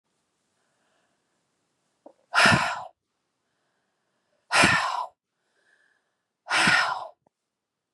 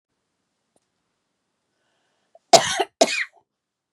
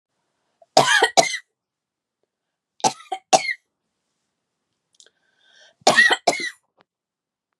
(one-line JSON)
{"exhalation_length": "7.9 s", "exhalation_amplitude": 22795, "exhalation_signal_mean_std_ratio": 0.33, "cough_length": "3.9 s", "cough_amplitude": 32768, "cough_signal_mean_std_ratio": 0.21, "three_cough_length": "7.6 s", "three_cough_amplitude": 32454, "three_cough_signal_mean_std_ratio": 0.29, "survey_phase": "beta (2021-08-13 to 2022-03-07)", "age": "45-64", "gender": "Female", "wearing_mask": "No", "symptom_none": true, "smoker_status": "Never smoked", "respiratory_condition_asthma": false, "respiratory_condition_other": false, "recruitment_source": "REACT", "submission_delay": "1 day", "covid_test_result": "Negative", "covid_test_method": "RT-qPCR", "influenza_a_test_result": "Unknown/Void", "influenza_b_test_result": "Unknown/Void"}